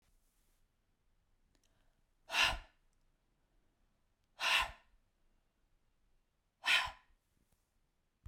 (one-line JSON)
{"exhalation_length": "8.3 s", "exhalation_amplitude": 4391, "exhalation_signal_mean_std_ratio": 0.25, "survey_phase": "beta (2021-08-13 to 2022-03-07)", "age": "45-64", "gender": "Female", "wearing_mask": "No", "symptom_none": true, "smoker_status": "Ex-smoker", "respiratory_condition_asthma": true, "respiratory_condition_other": false, "recruitment_source": "REACT", "submission_delay": "1 day", "covid_test_result": "Negative", "covid_test_method": "RT-qPCR"}